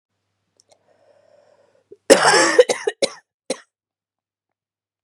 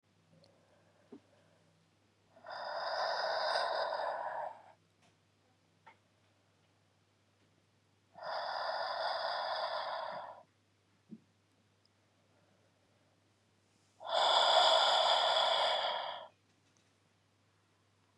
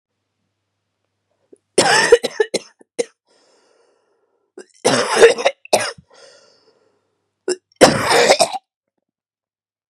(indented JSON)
{
  "cough_length": "5.0 s",
  "cough_amplitude": 32768,
  "cough_signal_mean_std_ratio": 0.27,
  "exhalation_length": "18.2 s",
  "exhalation_amplitude": 6149,
  "exhalation_signal_mean_std_ratio": 0.46,
  "three_cough_length": "9.9 s",
  "three_cough_amplitude": 32768,
  "three_cough_signal_mean_std_ratio": 0.33,
  "survey_phase": "beta (2021-08-13 to 2022-03-07)",
  "age": "18-44",
  "gender": "Female",
  "wearing_mask": "No",
  "symptom_cough_any": true,
  "symptom_runny_or_blocked_nose": true,
  "symptom_sore_throat": true,
  "symptom_fatigue": true,
  "symptom_headache": true,
  "symptom_change_to_sense_of_smell_or_taste": true,
  "smoker_status": "Never smoked",
  "respiratory_condition_asthma": false,
  "respiratory_condition_other": false,
  "recruitment_source": "Test and Trace",
  "submission_delay": "2 days",
  "covid_test_result": "Positive",
  "covid_test_method": "RT-qPCR",
  "covid_ct_value": 33.7,
  "covid_ct_gene": "N gene"
}